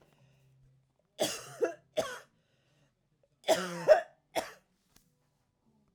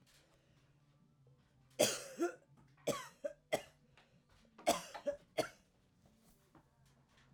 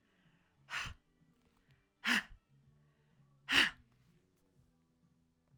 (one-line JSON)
{"cough_length": "5.9 s", "cough_amplitude": 10307, "cough_signal_mean_std_ratio": 0.27, "three_cough_length": "7.3 s", "three_cough_amplitude": 4330, "three_cough_signal_mean_std_ratio": 0.3, "exhalation_length": "5.6 s", "exhalation_amplitude": 6168, "exhalation_signal_mean_std_ratio": 0.25, "survey_phase": "alpha (2021-03-01 to 2021-08-12)", "age": "45-64", "gender": "Female", "wearing_mask": "No", "symptom_none": true, "smoker_status": "Never smoked", "respiratory_condition_asthma": false, "respiratory_condition_other": false, "recruitment_source": "REACT", "submission_delay": "1 day", "covid_test_result": "Negative", "covid_test_method": "RT-qPCR"}